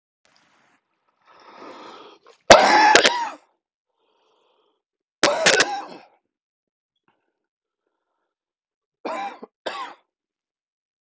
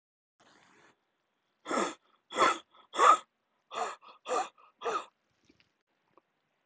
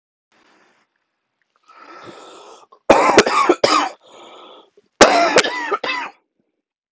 {"three_cough_length": "11.0 s", "three_cough_amplitude": 30230, "three_cough_signal_mean_std_ratio": 0.27, "exhalation_length": "6.7 s", "exhalation_amplitude": 12875, "exhalation_signal_mean_std_ratio": 0.3, "cough_length": "6.9 s", "cough_amplitude": 30230, "cough_signal_mean_std_ratio": 0.39, "survey_phase": "alpha (2021-03-01 to 2021-08-12)", "age": "18-44", "gender": "Male", "wearing_mask": "No", "symptom_cough_any": true, "symptom_new_continuous_cough": true, "symptom_shortness_of_breath": true, "symptom_fatigue": true, "symptom_fever_high_temperature": true, "symptom_headache": true, "symptom_change_to_sense_of_smell_or_taste": true, "symptom_onset": "3 days", "smoker_status": "Never smoked", "respiratory_condition_asthma": false, "respiratory_condition_other": false, "recruitment_source": "Test and Trace", "submission_delay": "1 day", "covid_test_result": "Positive", "covid_test_method": "RT-qPCR"}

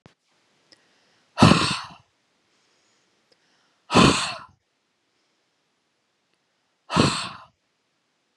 {"exhalation_length": "8.4 s", "exhalation_amplitude": 29858, "exhalation_signal_mean_std_ratio": 0.26, "survey_phase": "beta (2021-08-13 to 2022-03-07)", "age": "18-44", "gender": "Female", "wearing_mask": "No", "symptom_none": true, "smoker_status": "Never smoked", "respiratory_condition_asthma": false, "respiratory_condition_other": false, "recruitment_source": "REACT", "submission_delay": "3 days", "covid_test_result": "Negative", "covid_test_method": "RT-qPCR", "influenza_a_test_result": "Negative", "influenza_b_test_result": "Negative"}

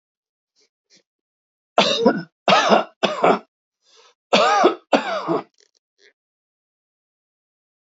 {"cough_length": "7.9 s", "cough_amplitude": 28062, "cough_signal_mean_std_ratio": 0.38, "survey_phase": "alpha (2021-03-01 to 2021-08-12)", "age": "65+", "gender": "Male", "wearing_mask": "No", "symptom_none": true, "smoker_status": "Never smoked", "respiratory_condition_asthma": false, "respiratory_condition_other": false, "recruitment_source": "REACT", "submission_delay": "1 day", "covid_test_result": "Negative", "covid_test_method": "RT-qPCR"}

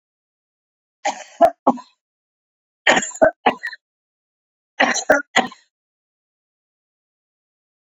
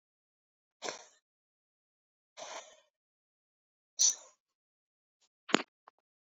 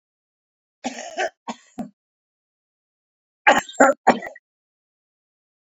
{"three_cough_length": "7.9 s", "three_cough_amplitude": 28688, "three_cough_signal_mean_std_ratio": 0.27, "exhalation_length": "6.3 s", "exhalation_amplitude": 19056, "exhalation_signal_mean_std_ratio": 0.17, "cough_length": "5.7 s", "cough_amplitude": 29451, "cough_signal_mean_std_ratio": 0.24, "survey_phase": "beta (2021-08-13 to 2022-03-07)", "age": "65+", "gender": "Male", "wearing_mask": "No", "symptom_none": true, "smoker_status": "Current smoker (1 to 10 cigarettes per day)", "respiratory_condition_asthma": false, "respiratory_condition_other": false, "recruitment_source": "REACT", "submission_delay": "1 day", "covid_test_result": "Negative", "covid_test_method": "RT-qPCR"}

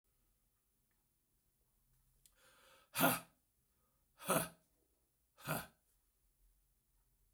{"exhalation_length": "7.3 s", "exhalation_amplitude": 4151, "exhalation_signal_mean_std_ratio": 0.23, "survey_phase": "beta (2021-08-13 to 2022-03-07)", "age": "65+", "gender": "Male", "wearing_mask": "No", "symptom_cough_any": true, "symptom_runny_or_blocked_nose": true, "symptom_fatigue": true, "symptom_headache": true, "smoker_status": "Never smoked", "respiratory_condition_asthma": false, "respiratory_condition_other": false, "recruitment_source": "Test and Trace", "submission_delay": "2 days", "covid_test_result": "Positive", "covid_test_method": "RT-qPCR", "covid_ct_value": 23.6, "covid_ct_gene": "ORF1ab gene", "covid_ct_mean": 24.5, "covid_viral_load": "9300 copies/ml", "covid_viral_load_category": "Minimal viral load (< 10K copies/ml)"}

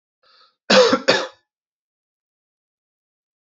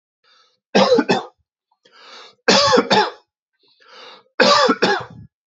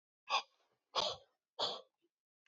{"cough_length": "3.4 s", "cough_amplitude": 30747, "cough_signal_mean_std_ratio": 0.28, "three_cough_length": "5.5 s", "three_cough_amplitude": 29025, "three_cough_signal_mean_std_ratio": 0.45, "exhalation_length": "2.5 s", "exhalation_amplitude": 2584, "exhalation_signal_mean_std_ratio": 0.35, "survey_phase": "beta (2021-08-13 to 2022-03-07)", "age": "18-44", "gender": "Male", "wearing_mask": "No", "symptom_none": true, "symptom_onset": "10 days", "smoker_status": "Never smoked", "respiratory_condition_asthma": false, "respiratory_condition_other": false, "recruitment_source": "REACT", "submission_delay": "2 days", "covid_test_result": "Negative", "covid_test_method": "RT-qPCR"}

